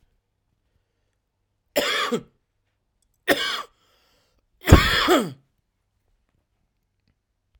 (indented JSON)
{
  "three_cough_length": "7.6 s",
  "three_cough_amplitude": 32768,
  "three_cough_signal_mean_std_ratio": 0.28,
  "survey_phase": "alpha (2021-03-01 to 2021-08-12)",
  "age": "18-44",
  "gender": "Male",
  "wearing_mask": "No",
  "symptom_none": true,
  "smoker_status": "Never smoked",
  "respiratory_condition_asthma": false,
  "respiratory_condition_other": false,
  "recruitment_source": "REACT",
  "submission_delay": "6 days",
  "covid_test_result": "Negative",
  "covid_test_method": "RT-qPCR"
}